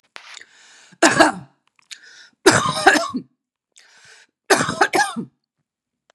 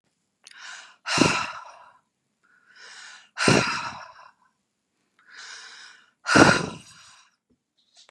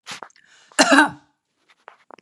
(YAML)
three_cough_length: 6.1 s
three_cough_amplitude: 32767
three_cough_signal_mean_std_ratio: 0.37
exhalation_length: 8.1 s
exhalation_amplitude: 32697
exhalation_signal_mean_std_ratio: 0.31
cough_length: 2.2 s
cough_amplitude: 32331
cough_signal_mean_std_ratio: 0.3
survey_phase: beta (2021-08-13 to 2022-03-07)
age: 45-64
gender: Female
wearing_mask: 'No'
symptom_fatigue: true
symptom_onset: 11 days
smoker_status: Ex-smoker
respiratory_condition_asthma: false
respiratory_condition_other: false
recruitment_source: Test and Trace
submission_delay: 1 day
covid_test_result: Negative
covid_test_method: RT-qPCR